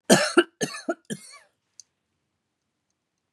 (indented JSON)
{
  "cough_length": "3.3 s",
  "cough_amplitude": 27366,
  "cough_signal_mean_std_ratio": 0.26,
  "survey_phase": "beta (2021-08-13 to 2022-03-07)",
  "age": "45-64",
  "gender": "Female",
  "wearing_mask": "No",
  "symptom_none": true,
  "smoker_status": "Never smoked",
  "respiratory_condition_asthma": false,
  "respiratory_condition_other": false,
  "recruitment_source": "REACT",
  "submission_delay": "2 days",
  "covid_test_result": "Negative",
  "covid_test_method": "RT-qPCR",
  "influenza_a_test_result": "Negative",
  "influenza_b_test_result": "Negative"
}